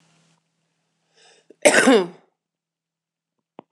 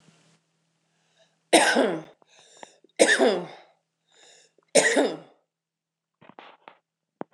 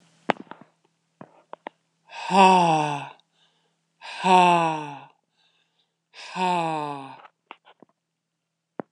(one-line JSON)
{"cough_length": "3.7 s", "cough_amplitude": 26028, "cough_signal_mean_std_ratio": 0.26, "three_cough_length": "7.3 s", "three_cough_amplitude": 23060, "three_cough_signal_mean_std_ratio": 0.32, "exhalation_length": "8.9 s", "exhalation_amplitude": 25956, "exhalation_signal_mean_std_ratio": 0.36, "survey_phase": "beta (2021-08-13 to 2022-03-07)", "age": "45-64", "gender": "Female", "wearing_mask": "No", "symptom_none": true, "smoker_status": "Current smoker (11 or more cigarettes per day)", "respiratory_condition_asthma": false, "respiratory_condition_other": false, "recruitment_source": "REACT", "submission_delay": "3 days", "covid_test_result": "Negative", "covid_test_method": "RT-qPCR", "influenza_a_test_result": "Negative", "influenza_b_test_result": "Negative"}